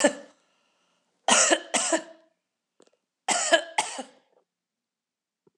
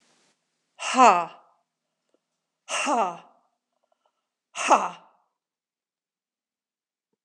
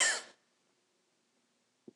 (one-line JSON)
{"three_cough_length": "5.6 s", "three_cough_amplitude": 23124, "three_cough_signal_mean_std_ratio": 0.35, "exhalation_length": "7.2 s", "exhalation_amplitude": 24255, "exhalation_signal_mean_std_ratio": 0.25, "cough_length": "2.0 s", "cough_amplitude": 5402, "cough_signal_mean_std_ratio": 0.26, "survey_phase": "alpha (2021-03-01 to 2021-08-12)", "age": "65+", "gender": "Female", "wearing_mask": "No", "symptom_fatigue": true, "symptom_headache": true, "smoker_status": "Ex-smoker", "respiratory_condition_asthma": false, "respiratory_condition_other": false, "recruitment_source": "Test and Trace", "submission_delay": "2 days", "covid_test_result": "Positive", "covid_test_method": "RT-qPCR", "covid_ct_value": 36.9, "covid_ct_gene": "N gene"}